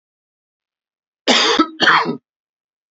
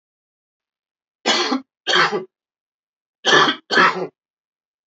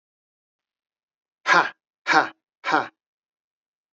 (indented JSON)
{
  "cough_length": "2.9 s",
  "cough_amplitude": 30428,
  "cough_signal_mean_std_ratio": 0.4,
  "three_cough_length": "4.9 s",
  "three_cough_amplitude": 30242,
  "three_cough_signal_mean_std_ratio": 0.4,
  "exhalation_length": "3.9 s",
  "exhalation_amplitude": 23726,
  "exhalation_signal_mean_std_ratio": 0.28,
  "survey_phase": "beta (2021-08-13 to 2022-03-07)",
  "age": "45-64",
  "gender": "Male",
  "wearing_mask": "No",
  "symptom_cough_any": true,
  "symptom_fatigue": true,
  "symptom_fever_high_temperature": true,
  "symptom_headache": true,
  "symptom_change_to_sense_of_smell_or_taste": true,
  "symptom_loss_of_taste": true,
  "symptom_other": true,
  "symptom_onset": "3 days",
  "smoker_status": "Ex-smoker",
  "respiratory_condition_asthma": true,
  "respiratory_condition_other": false,
  "recruitment_source": "Test and Trace",
  "submission_delay": "2 days",
  "covid_test_result": "Positive",
  "covid_test_method": "RT-qPCR",
  "covid_ct_value": 22.6,
  "covid_ct_gene": "ORF1ab gene",
  "covid_ct_mean": 23.4,
  "covid_viral_load": "21000 copies/ml",
  "covid_viral_load_category": "Low viral load (10K-1M copies/ml)"
}